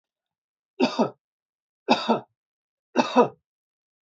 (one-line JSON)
{"three_cough_length": "4.0 s", "three_cough_amplitude": 19852, "three_cough_signal_mean_std_ratio": 0.31, "survey_phase": "beta (2021-08-13 to 2022-03-07)", "age": "45-64", "gender": "Male", "wearing_mask": "No", "symptom_none": true, "smoker_status": "Never smoked", "respiratory_condition_asthma": false, "respiratory_condition_other": false, "recruitment_source": "REACT", "submission_delay": "1 day", "covid_test_result": "Negative", "covid_test_method": "RT-qPCR"}